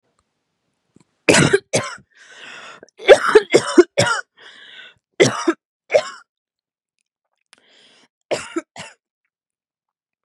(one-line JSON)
{"three_cough_length": "10.2 s", "three_cough_amplitude": 32768, "three_cough_signal_mean_std_ratio": 0.29, "survey_phase": "beta (2021-08-13 to 2022-03-07)", "age": "18-44", "gender": "Female", "wearing_mask": "No", "symptom_cough_any": true, "symptom_runny_or_blocked_nose": true, "symptom_fatigue": true, "smoker_status": "Never smoked", "respiratory_condition_asthma": false, "respiratory_condition_other": false, "recruitment_source": "REACT", "submission_delay": "2 days", "covid_test_result": "Negative", "covid_test_method": "RT-qPCR", "influenza_a_test_result": "Negative", "influenza_b_test_result": "Negative"}